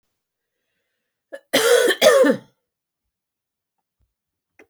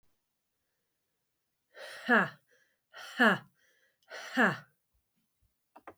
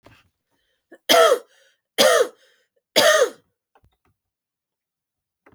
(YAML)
cough_length: 4.7 s
cough_amplitude: 30662
cough_signal_mean_std_ratio: 0.33
exhalation_length: 6.0 s
exhalation_amplitude: 8322
exhalation_signal_mean_std_ratio: 0.28
three_cough_length: 5.5 s
three_cough_amplitude: 32334
three_cough_signal_mean_std_ratio: 0.33
survey_phase: beta (2021-08-13 to 2022-03-07)
age: 45-64
gender: Female
wearing_mask: 'No'
symptom_runny_or_blocked_nose: true
symptom_sore_throat: true
symptom_change_to_sense_of_smell_or_taste: true
symptom_loss_of_taste: true
smoker_status: Never smoked
respiratory_condition_asthma: false
respiratory_condition_other: false
recruitment_source: Test and Trace
submission_delay: 2 days
covid_test_result: Positive
covid_test_method: RT-qPCR
covid_ct_value: 20.0
covid_ct_gene: ORF1ab gene